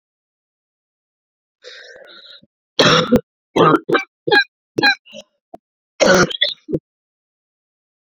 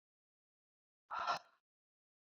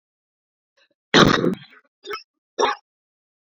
{"three_cough_length": "8.2 s", "three_cough_amplitude": 32184, "three_cough_signal_mean_std_ratio": 0.35, "exhalation_length": "2.4 s", "exhalation_amplitude": 1811, "exhalation_signal_mean_std_ratio": 0.26, "cough_length": "3.5 s", "cough_amplitude": 28065, "cough_signal_mean_std_ratio": 0.3, "survey_phase": "beta (2021-08-13 to 2022-03-07)", "age": "45-64", "gender": "Female", "wearing_mask": "No", "symptom_cough_any": true, "symptom_runny_or_blocked_nose": true, "symptom_shortness_of_breath": true, "symptom_onset": "2 days", "smoker_status": "Ex-smoker", "respiratory_condition_asthma": false, "respiratory_condition_other": false, "recruitment_source": "Test and Trace", "submission_delay": "1 day", "covid_test_result": "Positive", "covid_test_method": "RT-qPCR", "covid_ct_value": 16.2, "covid_ct_gene": "ORF1ab gene", "covid_ct_mean": 16.8, "covid_viral_load": "3200000 copies/ml", "covid_viral_load_category": "High viral load (>1M copies/ml)"}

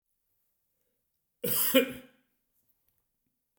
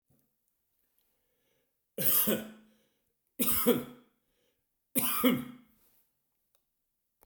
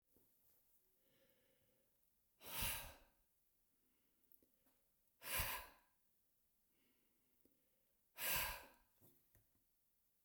{"cough_length": "3.6 s", "cough_amplitude": 12121, "cough_signal_mean_std_ratio": 0.27, "three_cough_length": "7.3 s", "three_cough_amplitude": 8603, "three_cough_signal_mean_std_ratio": 0.35, "exhalation_length": "10.2 s", "exhalation_amplitude": 1124, "exhalation_signal_mean_std_ratio": 0.31, "survey_phase": "beta (2021-08-13 to 2022-03-07)", "age": "65+", "gender": "Male", "wearing_mask": "No", "symptom_none": true, "smoker_status": "Never smoked", "respiratory_condition_asthma": false, "respiratory_condition_other": false, "recruitment_source": "REACT", "submission_delay": "7 days", "covid_test_result": "Negative", "covid_test_method": "RT-qPCR", "influenza_a_test_result": "Negative", "influenza_b_test_result": "Negative"}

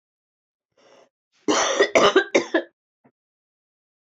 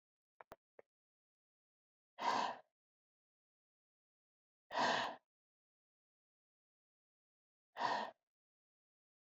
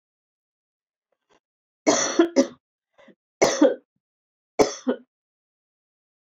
{"cough_length": "4.1 s", "cough_amplitude": 22716, "cough_signal_mean_std_ratio": 0.35, "exhalation_length": "9.3 s", "exhalation_amplitude": 1933, "exhalation_signal_mean_std_ratio": 0.27, "three_cough_length": "6.2 s", "three_cough_amplitude": 22692, "three_cough_signal_mean_std_ratio": 0.29, "survey_phase": "beta (2021-08-13 to 2022-03-07)", "age": "45-64", "gender": "Female", "wearing_mask": "No", "symptom_cough_any": true, "symptom_runny_or_blocked_nose": true, "symptom_shortness_of_breath": true, "symptom_sore_throat": true, "symptom_fatigue": true, "symptom_fever_high_temperature": true, "symptom_change_to_sense_of_smell_or_taste": true, "symptom_loss_of_taste": true, "symptom_onset": "7 days", "smoker_status": "Never smoked", "respiratory_condition_asthma": false, "respiratory_condition_other": false, "recruitment_source": "Test and Trace", "submission_delay": "2 days", "covid_test_result": "Positive", "covid_test_method": "RT-qPCR", "covid_ct_value": 19.5, "covid_ct_gene": "N gene", "covid_ct_mean": 20.1, "covid_viral_load": "260000 copies/ml", "covid_viral_load_category": "Low viral load (10K-1M copies/ml)"}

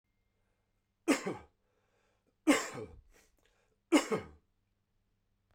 {"three_cough_length": "5.5 s", "three_cough_amplitude": 6466, "three_cough_signal_mean_std_ratio": 0.27, "survey_phase": "beta (2021-08-13 to 2022-03-07)", "age": "45-64", "gender": "Male", "wearing_mask": "No", "symptom_cough_any": true, "symptom_runny_or_blocked_nose": true, "symptom_fatigue": true, "symptom_headache": true, "symptom_onset": "3 days", "smoker_status": "Never smoked", "respiratory_condition_asthma": false, "respiratory_condition_other": false, "recruitment_source": "Test and Trace", "submission_delay": "1 day", "covid_test_result": "Positive", "covid_test_method": "RT-qPCR", "covid_ct_value": 15.6, "covid_ct_gene": "ORF1ab gene", "covid_ct_mean": 15.7, "covid_viral_load": "6800000 copies/ml", "covid_viral_load_category": "High viral load (>1M copies/ml)"}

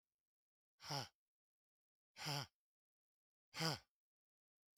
{"exhalation_length": "4.8 s", "exhalation_amplitude": 1885, "exhalation_signal_mean_std_ratio": 0.28, "survey_phase": "beta (2021-08-13 to 2022-03-07)", "age": "45-64", "gender": "Male", "wearing_mask": "No", "symptom_none": true, "smoker_status": "Never smoked", "respiratory_condition_asthma": false, "respiratory_condition_other": false, "recruitment_source": "REACT", "submission_delay": "2 days", "covid_test_result": "Negative", "covid_test_method": "RT-qPCR", "influenza_a_test_result": "Negative", "influenza_b_test_result": "Negative"}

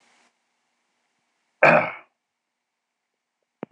{"cough_length": "3.7 s", "cough_amplitude": 25812, "cough_signal_mean_std_ratio": 0.2, "survey_phase": "beta (2021-08-13 to 2022-03-07)", "age": "18-44", "gender": "Male", "wearing_mask": "No", "symptom_none": true, "symptom_onset": "6 days", "smoker_status": "Never smoked", "respiratory_condition_asthma": false, "respiratory_condition_other": false, "recruitment_source": "REACT", "submission_delay": "3 days", "covid_test_result": "Negative", "covid_test_method": "RT-qPCR", "influenza_a_test_result": "Negative", "influenza_b_test_result": "Negative"}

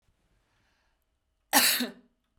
{"cough_length": "2.4 s", "cough_amplitude": 16101, "cough_signal_mean_std_ratio": 0.3, "survey_phase": "beta (2021-08-13 to 2022-03-07)", "age": "18-44", "gender": "Female", "wearing_mask": "No", "symptom_none": true, "smoker_status": "Never smoked", "respiratory_condition_asthma": false, "respiratory_condition_other": false, "recruitment_source": "REACT", "submission_delay": "2 days", "covid_test_result": "Negative", "covid_test_method": "RT-qPCR", "covid_ct_value": 40.0, "covid_ct_gene": "N gene"}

